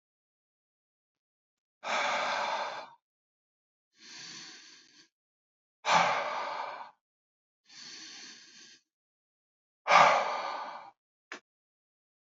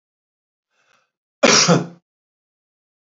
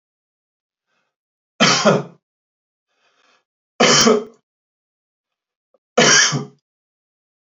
{"exhalation_length": "12.2 s", "exhalation_amplitude": 13756, "exhalation_signal_mean_std_ratio": 0.34, "cough_length": "3.2 s", "cough_amplitude": 28312, "cough_signal_mean_std_ratio": 0.28, "three_cough_length": "7.4 s", "three_cough_amplitude": 31695, "three_cough_signal_mean_std_ratio": 0.33, "survey_phase": "beta (2021-08-13 to 2022-03-07)", "age": "45-64", "gender": "Male", "wearing_mask": "No", "symptom_none": true, "smoker_status": "Never smoked", "respiratory_condition_asthma": false, "respiratory_condition_other": false, "recruitment_source": "REACT", "submission_delay": "1 day", "covid_test_result": "Negative", "covid_test_method": "RT-qPCR", "influenza_a_test_result": "Negative", "influenza_b_test_result": "Negative"}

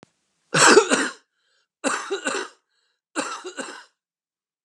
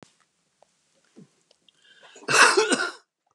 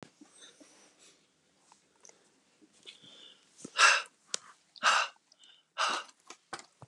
{"three_cough_length": "4.6 s", "three_cough_amplitude": 31295, "three_cough_signal_mean_std_ratio": 0.35, "cough_length": "3.3 s", "cough_amplitude": 27308, "cough_signal_mean_std_ratio": 0.32, "exhalation_length": "6.9 s", "exhalation_amplitude": 14013, "exhalation_signal_mean_std_ratio": 0.27, "survey_phase": "beta (2021-08-13 to 2022-03-07)", "age": "65+", "gender": "Male", "wearing_mask": "No", "symptom_shortness_of_breath": true, "symptom_fatigue": true, "smoker_status": "Never smoked", "respiratory_condition_asthma": false, "respiratory_condition_other": false, "recruitment_source": "Test and Trace", "submission_delay": "1 day", "covid_test_result": "Negative", "covid_test_method": "RT-qPCR"}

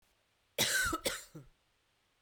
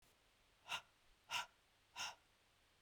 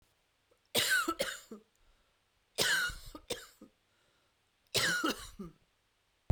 {"cough_length": "2.2 s", "cough_amplitude": 4435, "cough_signal_mean_std_ratio": 0.43, "exhalation_length": "2.8 s", "exhalation_amplitude": 1007, "exhalation_signal_mean_std_ratio": 0.36, "three_cough_length": "6.3 s", "three_cough_amplitude": 5840, "three_cough_signal_mean_std_ratio": 0.42, "survey_phase": "beta (2021-08-13 to 2022-03-07)", "age": "45-64", "gender": "Female", "wearing_mask": "No", "symptom_cough_any": true, "symptom_abdominal_pain": true, "symptom_fever_high_temperature": true, "symptom_headache": true, "smoker_status": "Never smoked", "respiratory_condition_asthma": false, "respiratory_condition_other": false, "recruitment_source": "Test and Trace", "submission_delay": "1 day", "covid_test_result": "Positive", "covid_test_method": "RT-qPCR", "covid_ct_value": 27.9, "covid_ct_gene": "N gene", "covid_ct_mean": 28.0, "covid_viral_load": "650 copies/ml", "covid_viral_load_category": "Minimal viral load (< 10K copies/ml)"}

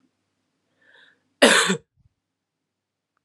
{"cough_length": "3.2 s", "cough_amplitude": 30310, "cough_signal_mean_std_ratio": 0.24, "survey_phase": "alpha (2021-03-01 to 2021-08-12)", "age": "18-44", "gender": "Female", "wearing_mask": "No", "symptom_new_continuous_cough": true, "symptom_fatigue": true, "symptom_headache": true, "smoker_status": "Never smoked", "respiratory_condition_asthma": true, "respiratory_condition_other": false, "recruitment_source": "Test and Trace", "submission_delay": "1 day", "covid_test_result": "Positive", "covid_test_method": "RT-qPCR", "covid_ct_value": 28.6, "covid_ct_gene": "ORF1ab gene"}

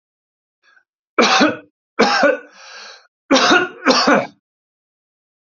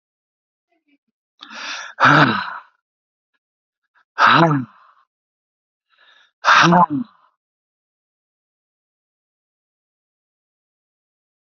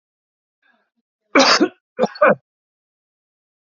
{"three_cough_length": "5.5 s", "three_cough_amplitude": 30514, "three_cough_signal_mean_std_ratio": 0.44, "exhalation_length": "11.5 s", "exhalation_amplitude": 32768, "exhalation_signal_mean_std_ratio": 0.29, "cough_length": "3.7 s", "cough_amplitude": 29637, "cough_signal_mean_std_ratio": 0.3, "survey_phase": "alpha (2021-03-01 to 2021-08-12)", "age": "65+", "gender": "Male", "wearing_mask": "No", "symptom_none": true, "smoker_status": "Never smoked", "respiratory_condition_asthma": false, "respiratory_condition_other": false, "recruitment_source": "REACT", "submission_delay": "3 days", "covid_test_result": "Negative", "covid_test_method": "RT-qPCR"}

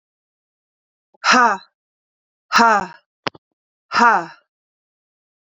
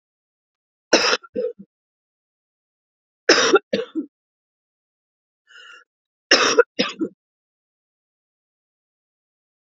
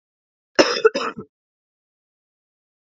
{"exhalation_length": "5.5 s", "exhalation_amplitude": 32172, "exhalation_signal_mean_std_ratio": 0.32, "three_cough_length": "9.7 s", "three_cough_amplitude": 32767, "three_cough_signal_mean_std_ratio": 0.27, "cough_length": "3.0 s", "cough_amplitude": 30074, "cough_signal_mean_std_ratio": 0.24, "survey_phase": "beta (2021-08-13 to 2022-03-07)", "age": "45-64", "gender": "Female", "wearing_mask": "No", "symptom_new_continuous_cough": true, "symptom_runny_or_blocked_nose": true, "symptom_fatigue": true, "symptom_change_to_sense_of_smell_or_taste": true, "symptom_onset": "4 days", "smoker_status": "Never smoked", "respiratory_condition_asthma": false, "respiratory_condition_other": false, "recruitment_source": "Test and Trace", "submission_delay": "1 day", "covid_test_result": "Positive", "covid_test_method": "RT-qPCR", "covid_ct_value": 20.0, "covid_ct_gene": "ORF1ab gene"}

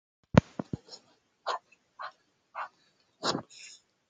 {"exhalation_length": "4.1 s", "exhalation_amplitude": 24469, "exhalation_signal_mean_std_ratio": 0.2, "survey_phase": "beta (2021-08-13 to 2022-03-07)", "age": "18-44", "gender": "Female", "wearing_mask": "No", "symptom_runny_or_blocked_nose": true, "symptom_fatigue": true, "smoker_status": "Never smoked", "respiratory_condition_asthma": false, "respiratory_condition_other": false, "recruitment_source": "Test and Trace", "submission_delay": "2 days", "covid_test_result": "Positive", "covid_test_method": "ePCR"}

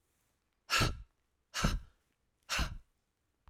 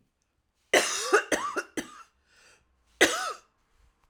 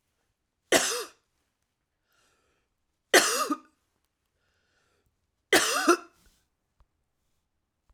{"exhalation_length": "3.5 s", "exhalation_amplitude": 4770, "exhalation_signal_mean_std_ratio": 0.37, "cough_length": "4.1 s", "cough_amplitude": 18247, "cough_signal_mean_std_ratio": 0.37, "three_cough_length": "7.9 s", "three_cough_amplitude": 20473, "three_cough_signal_mean_std_ratio": 0.27, "survey_phase": "alpha (2021-03-01 to 2021-08-12)", "age": "45-64", "gender": "Female", "wearing_mask": "No", "symptom_cough_any": true, "symptom_fatigue": true, "symptom_fever_high_temperature": true, "symptom_headache": true, "smoker_status": "Never smoked", "respiratory_condition_asthma": false, "respiratory_condition_other": false, "recruitment_source": "Test and Trace", "submission_delay": "2 days", "covid_test_result": "Positive", "covid_test_method": "RT-qPCR", "covid_ct_value": 37.9, "covid_ct_gene": "N gene"}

